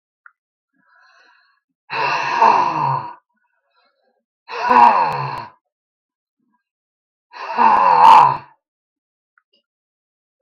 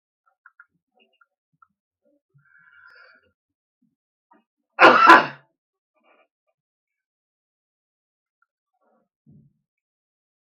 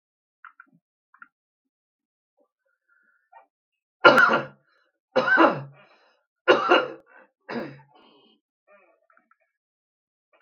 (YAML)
exhalation_length: 10.4 s
exhalation_amplitude: 32768
exhalation_signal_mean_std_ratio: 0.39
cough_length: 10.6 s
cough_amplitude: 32766
cough_signal_mean_std_ratio: 0.16
three_cough_length: 10.4 s
three_cough_amplitude: 32768
three_cough_signal_mean_std_ratio: 0.26
survey_phase: beta (2021-08-13 to 2022-03-07)
age: 65+
gender: Male
wearing_mask: 'No'
symptom_none: true
smoker_status: Ex-smoker
respiratory_condition_asthma: true
respiratory_condition_other: false
recruitment_source: REACT
submission_delay: 4 days
covid_test_result: Negative
covid_test_method: RT-qPCR